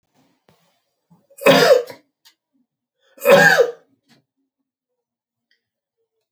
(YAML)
cough_length: 6.3 s
cough_amplitude: 29751
cough_signal_mean_std_ratio: 0.3
survey_phase: alpha (2021-03-01 to 2021-08-12)
age: 65+
gender: Male
wearing_mask: 'No'
symptom_none: true
smoker_status: Never smoked
respiratory_condition_asthma: false
respiratory_condition_other: false
recruitment_source: REACT
submission_delay: 2 days
covid_test_result: Negative
covid_test_method: RT-qPCR